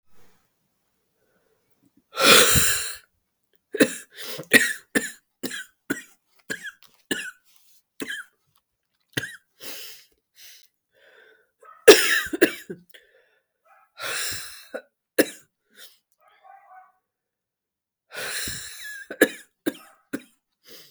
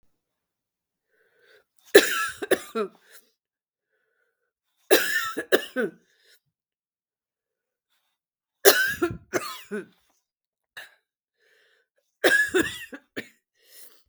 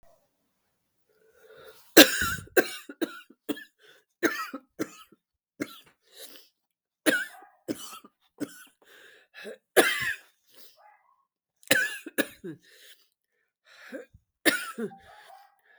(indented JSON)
{
  "exhalation_length": "20.9 s",
  "exhalation_amplitude": 32768,
  "exhalation_signal_mean_std_ratio": 0.27,
  "three_cough_length": "14.1 s",
  "three_cough_amplitude": 32768,
  "three_cough_signal_mean_std_ratio": 0.28,
  "cough_length": "15.8 s",
  "cough_amplitude": 32768,
  "cough_signal_mean_std_ratio": 0.25,
  "survey_phase": "beta (2021-08-13 to 2022-03-07)",
  "age": "45-64",
  "gender": "Female",
  "wearing_mask": "No",
  "symptom_cough_any": true,
  "symptom_shortness_of_breath": true,
  "symptom_fatigue": true,
  "symptom_headache": true,
  "symptom_change_to_sense_of_smell_or_taste": true,
  "symptom_onset": "1 day",
  "smoker_status": "Never smoked",
  "respiratory_condition_asthma": true,
  "respiratory_condition_other": false,
  "recruitment_source": "Test and Trace",
  "submission_delay": "1 day",
  "covid_test_result": "Positive",
  "covid_test_method": "RT-qPCR",
  "covid_ct_value": 18.5,
  "covid_ct_gene": "ORF1ab gene",
  "covid_ct_mean": 18.8,
  "covid_viral_load": "700000 copies/ml",
  "covid_viral_load_category": "Low viral load (10K-1M copies/ml)"
}